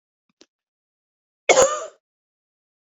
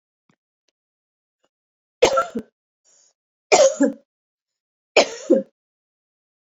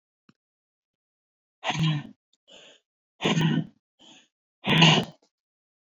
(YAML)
cough_length: 2.9 s
cough_amplitude: 26784
cough_signal_mean_std_ratio: 0.24
three_cough_length: 6.6 s
three_cough_amplitude: 27921
three_cough_signal_mean_std_ratio: 0.28
exhalation_length: 5.8 s
exhalation_amplitude: 20109
exhalation_signal_mean_std_ratio: 0.35
survey_phase: beta (2021-08-13 to 2022-03-07)
age: 45-64
gender: Female
wearing_mask: 'No'
symptom_none: true
smoker_status: Ex-smoker
respiratory_condition_asthma: false
respiratory_condition_other: false
recruitment_source: REACT
submission_delay: 2 days
covid_test_result: Negative
covid_test_method: RT-qPCR